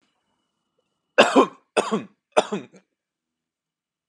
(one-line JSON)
{"three_cough_length": "4.1 s", "three_cough_amplitude": 32566, "three_cough_signal_mean_std_ratio": 0.27, "survey_phase": "beta (2021-08-13 to 2022-03-07)", "age": "18-44", "gender": "Male", "wearing_mask": "No", "symptom_none": true, "smoker_status": "Never smoked", "respiratory_condition_asthma": false, "respiratory_condition_other": false, "recruitment_source": "REACT", "submission_delay": "3 days", "covid_test_result": "Negative", "covid_test_method": "RT-qPCR", "influenza_a_test_result": "Negative", "influenza_b_test_result": "Negative"}